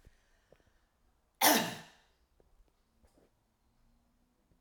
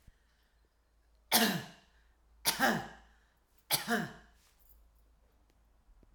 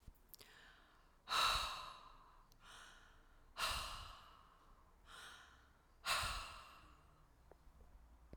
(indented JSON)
{
  "cough_length": "4.6 s",
  "cough_amplitude": 9912,
  "cough_signal_mean_std_ratio": 0.21,
  "three_cough_length": "6.1 s",
  "three_cough_amplitude": 8061,
  "three_cough_signal_mean_std_ratio": 0.33,
  "exhalation_length": "8.4 s",
  "exhalation_amplitude": 2073,
  "exhalation_signal_mean_std_ratio": 0.44,
  "survey_phase": "alpha (2021-03-01 to 2021-08-12)",
  "age": "45-64",
  "gender": "Female",
  "wearing_mask": "No",
  "symptom_none": true,
  "smoker_status": "Never smoked",
  "respiratory_condition_asthma": false,
  "respiratory_condition_other": false,
  "recruitment_source": "REACT",
  "submission_delay": "1 day",
  "covid_test_result": "Negative",
  "covid_test_method": "RT-qPCR"
}